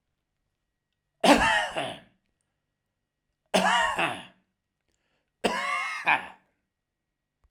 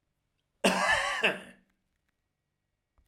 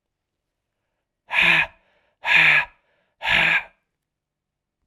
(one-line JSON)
{"three_cough_length": "7.5 s", "three_cough_amplitude": 21816, "three_cough_signal_mean_std_ratio": 0.37, "cough_length": "3.1 s", "cough_amplitude": 12555, "cough_signal_mean_std_ratio": 0.38, "exhalation_length": "4.9 s", "exhalation_amplitude": 22765, "exhalation_signal_mean_std_ratio": 0.39, "survey_phase": "alpha (2021-03-01 to 2021-08-12)", "age": "65+", "gender": "Male", "wearing_mask": "No", "symptom_shortness_of_breath": true, "symptom_abdominal_pain": true, "symptom_fatigue": true, "symptom_change_to_sense_of_smell_or_taste": true, "smoker_status": "Ex-smoker", "respiratory_condition_asthma": false, "respiratory_condition_other": false, "recruitment_source": "REACT", "submission_delay": "1 day", "covid_test_result": "Negative", "covid_test_method": "RT-qPCR"}